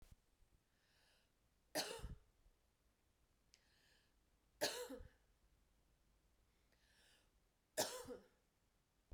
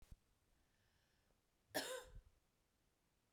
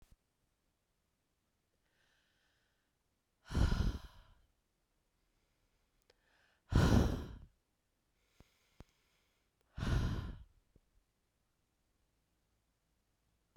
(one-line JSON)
{"three_cough_length": "9.1 s", "three_cough_amplitude": 1617, "three_cough_signal_mean_std_ratio": 0.29, "cough_length": "3.3 s", "cough_amplitude": 1487, "cough_signal_mean_std_ratio": 0.29, "exhalation_length": "13.6 s", "exhalation_amplitude": 4883, "exhalation_signal_mean_std_ratio": 0.26, "survey_phase": "beta (2021-08-13 to 2022-03-07)", "age": "45-64", "gender": "Female", "wearing_mask": "No", "symptom_new_continuous_cough": true, "symptom_runny_or_blocked_nose": true, "symptom_fatigue": true, "symptom_fever_high_temperature": true, "symptom_change_to_sense_of_smell_or_taste": true, "symptom_loss_of_taste": true, "symptom_onset": "3 days", "smoker_status": "Ex-smoker", "respiratory_condition_asthma": false, "respiratory_condition_other": false, "recruitment_source": "Test and Trace", "submission_delay": "2 days", "covid_test_result": "Positive", "covid_test_method": "RT-qPCR", "covid_ct_value": 15.5, "covid_ct_gene": "ORF1ab gene", "covid_ct_mean": 16.1, "covid_viral_load": "5200000 copies/ml", "covid_viral_load_category": "High viral load (>1M copies/ml)"}